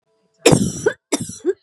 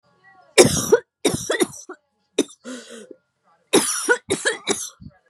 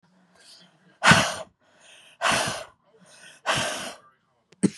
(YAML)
cough_length: 1.6 s
cough_amplitude: 32768
cough_signal_mean_std_ratio: 0.44
three_cough_length: 5.3 s
three_cough_amplitude: 32768
three_cough_signal_mean_std_ratio: 0.4
exhalation_length: 4.8 s
exhalation_amplitude: 24777
exhalation_signal_mean_std_ratio: 0.36
survey_phase: beta (2021-08-13 to 2022-03-07)
age: 18-44
gender: Female
wearing_mask: 'No'
symptom_cough_any: true
symptom_runny_or_blocked_nose: true
symptom_shortness_of_breath: true
symptom_sore_throat: true
symptom_fatigue: true
symptom_headache: true
smoker_status: Ex-smoker
respiratory_condition_asthma: false
respiratory_condition_other: false
recruitment_source: Test and Trace
submission_delay: 1 day
covid_test_result: Positive
covid_test_method: LFT